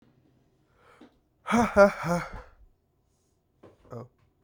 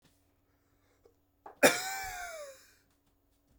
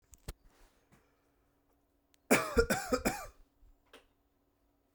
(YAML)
exhalation_length: 4.4 s
exhalation_amplitude: 18933
exhalation_signal_mean_std_ratio: 0.29
cough_length: 3.6 s
cough_amplitude: 13327
cough_signal_mean_std_ratio: 0.25
three_cough_length: 4.9 s
three_cough_amplitude: 8164
three_cough_signal_mean_std_ratio: 0.28
survey_phase: beta (2021-08-13 to 2022-03-07)
age: 18-44
gender: Male
wearing_mask: 'No'
symptom_cough_any: true
symptom_new_continuous_cough: true
symptom_runny_or_blocked_nose: true
symptom_shortness_of_breath: true
symptom_sore_throat: true
symptom_fatigue: true
symptom_fever_high_temperature: true
symptom_headache: true
symptom_change_to_sense_of_smell_or_taste: true
symptom_other: true
smoker_status: Never smoked
respiratory_condition_asthma: false
respiratory_condition_other: false
recruitment_source: Test and Trace
submission_delay: 2 days
covid_test_result: Positive
covid_test_method: RT-qPCR
covid_ct_value: 22.2
covid_ct_gene: ORF1ab gene